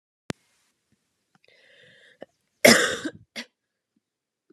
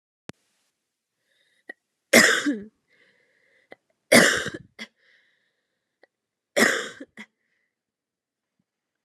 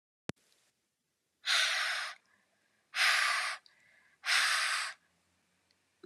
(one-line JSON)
{"cough_length": "4.5 s", "cough_amplitude": 30582, "cough_signal_mean_std_ratio": 0.2, "three_cough_length": "9.0 s", "three_cough_amplitude": 31388, "three_cough_signal_mean_std_ratio": 0.25, "exhalation_length": "6.1 s", "exhalation_amplitude": 6080, "exhalation_signal_mean_std_ratio": 0.47, "survey_phase": "alpha (2021-03-01 to 2021-08-12)", "age": "18-44", "gender": "Female", "wearing_mask": "No", "symptom_cough_any": true, "symptom_new_continuous_cough": true, "symptom_headache": true, "symptom_change_to_sense_of_smell_or_taste": true, "symptom_onset": "3 days", "smoker_status": "Never smoked", "respiratory_condition_asthma": false, "respiratory_condition_other": false, "recruitment_source": "Test and Trace", "submission_delay": "2 days", "covid_test_result": "Positive", "covid_test_method": "RT-qPCR", "covid_ct_value": 17.1, "covid_ct_gene": "ORF1ab gene", "covid_ct_mean": 17.6, "covid_viral_load": "1600000 copies/ml", "covid_viral_load_category": "High viral load (>1M copies/ml)"}